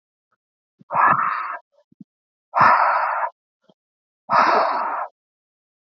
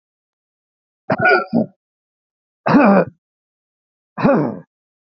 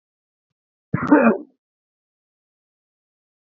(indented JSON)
{
  "exhalation_length": "5.8 s",
  "exhalation_amplitude": 24594,
  "exhalation_signal_mean_std_ratio": 0.48,
  "three_cough_length": "5.0 s",
  "three_cough_amplitude": 27562,
  "three_cough_signal_mean_std_ratio": 0.4,
  "cough_length": "3.6 s",
  "cough_amplitude": 26177,
  "cough_signal_mean_std_ratio": 0.24,
  "survey_phase": "beta (2021-08-13 to 2022-03-07)",
  "age": "18-44",
  "gender": "Male",
  "wearing_mask": "No",
  "symptom_none": true,
  "smoker_status": "Never smoked",
  "respiratory_condition_asthma": false,
  "respiratory_condition_other": false,
  "recruitment_source": "REACT",
  "submission_delay": "1 day",
  "covid_test_result": "Negative",
  "covid_test_method": "RT-qPCR",
  "influenza_a_test_result": "Negative",
  "influenza_b_test_result": "Negative"
}